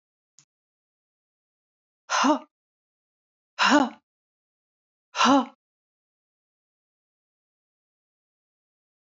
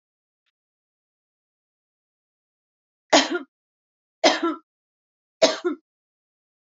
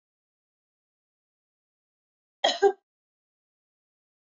{"exhalation_length": "9.0 s", "exhalation_amplitude": 14162, "exhalation_signal_mean_std_ratio": 0.24, "three_cough_length": "6.7 s", "three_cough_amplitude": 24143, "three_cough_signal_mean_std_ratio": 0.23, "cough_length": "4.3 s", "cough_amplitude": 12814, "cough_signal_mean_std_ratio": 0.16, "survey_phase": "beta (2021-08-13 to 2022-03-07)", "age": "45-64", "gender": "Female", "wearing_mask": "No", "symptom_none": true, "smoker_status": "Ex-smoker", "respiratory_condition_asthma": false, "respiratory_condition_other": false, "recruitment_source": "REACT", "submission_delay": "11 days", "covid_test_result": "Negative", "covid_test_method": "RT-qPCR"}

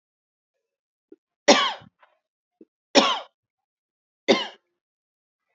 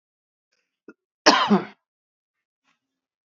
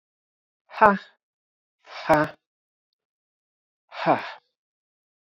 {"three_cough_length": "5.5 s", "three_cough_amplitude": 30441, "three_cough_signal_mean_std_ratio": 0.24, "cough_length": "3.3 s", "cough_amplitude": 29962, "cough_signal_mean_std_ratio": 0.24, "exhalation_length": "5.2 s", "exhalation_amplitude": 26401, "exhalation_signal_mean_std_ratio": 0.24, "survey_phase": "beta (2021-08-13 to 2022-03-07)", "age": "45-64", "gender": "Female", "wearing_mask": "No", "symptom_runny_or_blocked_nose": true, "symptom_onset": "5 days", "smoker_status": "Ex-smoker", "respiratory_condition_asthma": false, "respiratory_condition_other": false, "recruitment_source": "REACT", "submission_delay": "5 days", "covid_test_result": "Negative", "covid_test_method": "RT-qPCR", "influenza_a_test_result": "Unknown/Void", "influenza_b_test_result": "Unknown/Void"}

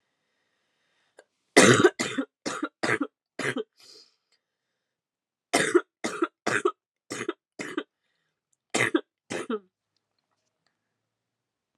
{"three_cough_length": "11.8 s", "three_cough_amplitude": 29158, "three_cough_signal_mean_std_ratio": 0.29, "survey_phase": "alpha (2021-03-01 to 2021-08-12)", "age": "18-44", "gender": "Female", "wearing_mask": "No", "symptom_cough_any": true, "symptom_new_continuous_cough": true, "symptom_headache": true, "symptom_change_to_sense_of_smell_or_taste": true, "symptom_loss_of_taste": true, "symptom_onset": "4 days", "smoker_status": "Never smoked", "respiratory_condition_asthma": false, "respiratory_condition_other": false, "recruitment_source": "Test and Trace", "submission_delay": "2 days", "covid_test_result": "Positive", "covid_test_method": "RT-qPCR", "covid_ct_value": 13.6, "covid_ct_gene": "ORF1ab gene", "covid_ct_mean": 13.9, "covid_viral_load": "27000000 copies/ml", "covid_viral_load_category": "High viral load (>1M copies/ml)"}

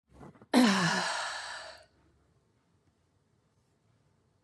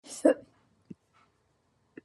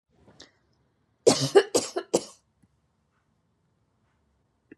{"exhalation_length": "4.4 s", "exhalation_amplitude": 9262, "exhalation_signal_mean_std_ratio": 0.36, "cough_length": "2.0 s", "cough_amplitude": 11523, "cough_signal_mean_std_ratio": 0.2, "three_cough_length": "4.8 s", "three_cough_amplitude": 20255, "three_cough_signal_mean_std_ratio": 0.23, "survey_phase": "beta (2021-08-13 to 2022-03-07)", "age": "45-64", "gender": "Male", "wearing_mask": "No", "symptom_none": true, "smoker_status": "Ex-smoker", "respiratory_condition_asthma": false, "respiratory_condition_other": false, "recruitment_source": "Test and Trace", "submission_delay": "2 days", "covid_test_result": "Negative", "covid_test_method": "ePCR"}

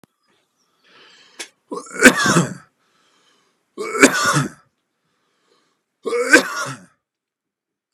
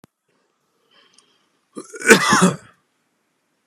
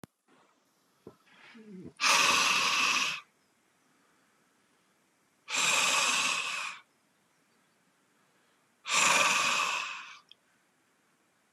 {"three_cough_length": "7.9 s", "three_cough_amplitude": 32768, "three_cough_signal_mean_std_ratio": 0.32, "cough_length": "3.7 s", "cough_amplitude": 32768, "cough_signal_mean_std_ratio": 0.28, "exhalation_length": "11.5 s", "exhalation_amplitude": 9790, "exhalation_signal_mean_std_ratio": 0.47, "survey_phase": "beta (2021-08-13 to 2022-03-07)", "age": "45-64", "gender": "Male", "wearing_mask": "No", "symptom_none": true, "smoker_status": "Ex-smoker", "respiratory_condition_asthma": false, "respiratory_condition_other": false, "recruitment_source": "REACT", "submission_delay": "3 days", "covid_test_result": "Negative", "covid_test_method": "RT-qPCR", "influenza_a_test_result": "Negative", "influenza_b_test_result": "Negative"}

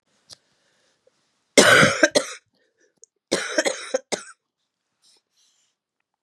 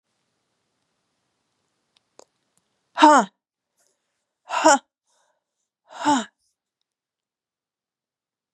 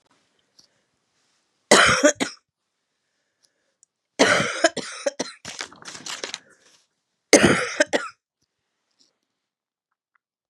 {"cough_length": "6.2 s", "cough_amplitude": 32767, "cough_signal_mean_std_ratio": 0.29, "exhalation_length": "8.5 s", "exhalation_amplitude": 31735, "exhalation_signal_mean_std_ratio": 0.21, "three_cough_length": "10.5 s", "three_cough_amplitude": 32768, "three_cough_signal_mean_std_ratio": 0.29, "survey_phase": "beta (2021-08-13 to 2022-03-07)", "age": "65+", "gender": "Female", "wearing_mask": "No", "symptom_cough_any": true, "symptom_sore_throat": true, "symptom_fatigue": true, "symptom_headache": true, "symptom_onset": "5 days", "smoker_status": "Ex-smoker", "respiratory_condition_asthma": false, "respiratory_condition_other": false, "recruitment_source": "Test and Trace", "submission_delay": "1 day", "covid_test_result": "Positive", "covid_test_method": "RT-qPCR", "covid_ct_value": 12.5, "covid_ct_gene": "N gene"}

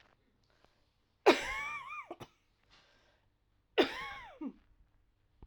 {"cough_length": "5.5 s", "cough_amplitude": 9281, "cough_signal_mean_std_ratio": 0.27, "survey_phase": "alpha (2021-03-01 to 2021-08-12)", "age": "45-64", "gender": "Female", "wearing_mask": "Yes", "symptom_cough_any": true, "symptom_abdominal_pain": true, "symptom_fatigue": true, "symptom_headache": true, "symptom_change_to_sense_of_smell_or_taste": true, "symptom_onset": "3 days", "smoker_status": "Ex-smoker", "respiratory_condition_asthma": true, "respiratory_condition_other": false, "recruitment_source": "Test and Trace", "submission_delay": "2 days", "covid_test_result": "Positive", "covid_test_method": "RT-qPCR", "covid_ct_value": 17.4, "covid_ct_gene": "ORF1ab gene", "covid_ct_mean": 17.9, "covid_viral_load": "1400000 copies/ml", "covid_viral_load_category": "High viral load (>1M copies/ml)"}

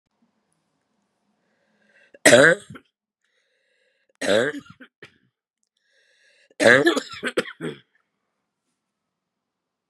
{"three_cough_length": "9.9 s", "three_cough_amplitude": 32768, "three_cough_signal_mean_std_ratio": 0.25, "survey_phase": "beta (2021-08-13 to 2022-03-07)", "age": "45-64", "gender": "Female", "wearing_mask": "No", "symptom_cough_any": true, "symptom_runny_or_blocked_nose": true, "symptom_shortness_of_breath": true, "symptom_sore_throat": true, "symptom_fatigue": true, "symptom_headache": true, "symptom_change_to_sense_of_smell_or_taste": true, "symptom_loss_of_taste": true, "symptom_onset": "3 days", "smoker_status": "Never smoked", "respiratory_condition_asthma": true, "respiratory_condition_other": false, "recruitment_source": "Test and Trace", "submission_delay": "2 days", "covid_test_result": "Positive", "covid_test_method": "RT-qPCR", "covid_ct_value": 15.1, "covid_ct_gene": "S gene", "covid_ct_mean": 15.4, "covid_viral_load": "8800000 copies/ml", "covid_viral_load_category": "High viral load (>1M copies/ml)"}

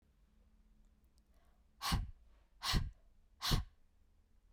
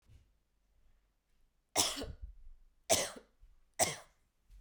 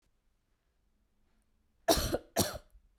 {"exhalation_length": "4.5 s", "exhalation_amplitude": 3312, "exhalation_signal_mean_std_ratio": 0.35, "three_cough_length": "4.6 s", "three_cough_amplitude": 7515, "three_cough_signal_mean_std_ratio": 0.32, "cough_length": "3.0 s", "cough_amplitude": 9947, "cough_signal_mean_std_ratio": 0.3, "survey_phase": "beta (2021-08-13 to 2022-03-07)", "age": "18-44", "gender": "Female", "wearing_mask": "No", "symptom_cough_any": true, "symptom_runny_or_blocked_nose": true, "symptom_shortness_of_breath": true, "symptom_sore_throat": true, "symptom_diarrhoea": true, "symptom_fatigue": true, "symptom_headache": true, "symptom_onset": "4 days", "smoker_status": "Never smoked", "respiratory_condition_asthma": false, "respiratory_condition_other": false, "recruitment_source": "Test and Trace", "submission_delay": "2 days", "covid_test_result": "Positive", "covid_test_method": "RT-qPCR", "covid_ct_value": 23.1, "covid_ct_gene": "N gene"}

